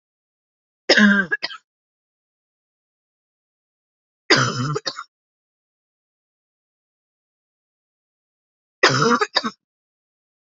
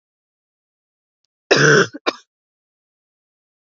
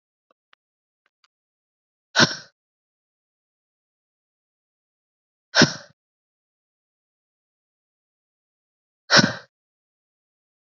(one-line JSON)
{"three_cough_length": "10.6 s", "three_cough_amplitude": 29079, "three_cough_signal_mean_std_ratio": 0.28, "cough_length": "3.8 s", "cough_amplitude": 31535, "cough_signal_mean_std_ratio": 0.26, "exhalation_length": "10.7 s", "exhalation_amplitude": 30352, "exhalation_signal_mean_std_ratio": 0.16, "survey_phase": "beta (2021-08-13 to 2022-03-07)", "age": "18-44", "gender": "Female", "wearing_mask": "No", "symptom_cough_any": true, "symptom_new_continuous_cough": true, "symptom_runny_or_blocked_nose": true, "symptom_shortness_of_breath": true, "symptom_sore_throat": true, "symptom_fatigue": true, "symptom_fever_high_temperature": true, "symptom_change_to_sense_of_smell_or_taste": true, "smoker_status": "Never smoked", "respiratory_condition_asthma": false, "respiratory_condition_other": false, "recruitment_source": "Test and Trace", "submission_delay": "3 days", "covid_test_result": "Positive", "covid_test_method": "RT-qPCR", "covid_ct_value": 14.9, "covid_ct_gene": "ORF1ab gene", "covid_ct_mean": 15.4, "covid_viral_load": "8900000 copies/ml", "covid_viral_load_category": "High viral load (>1M copies/ml)"}